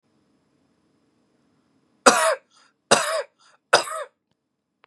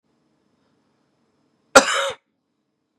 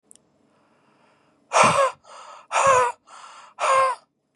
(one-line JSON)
{"three_cough_length": "4.9 s", "three_cough_amplitude": 32767, "three_cough_signal_mean_std_ratio": 0.28, "cough_length": "3.0 s", "cough_amplitude": 32768, "cough_signal_mean_std_ratio": 0.2, "exhalation_length": "4.4 s", "exhalation_amplitude": 23228, "exhalation_signal_mean_std_ratio": 0.43, "survey_phase": "beta (2021-08-13 to 2022-03-07)", "age": "18-44", "gender": "Male", "wearing_mask": "No", "symptom_none": true, "smoker_status": "Current smoker (e-cigarettes or vapes only)", "respiratory_condition_asthma": false, "respiratory_condition_other": false, "recruitment_source": "REACT", "submission_delay": "4 days", "covid_test_result": "Negative", "covid_test_method": "RT-qPCR", "influenza_a_test_result": "Negative", "influenza_b_test_result": "Negative"}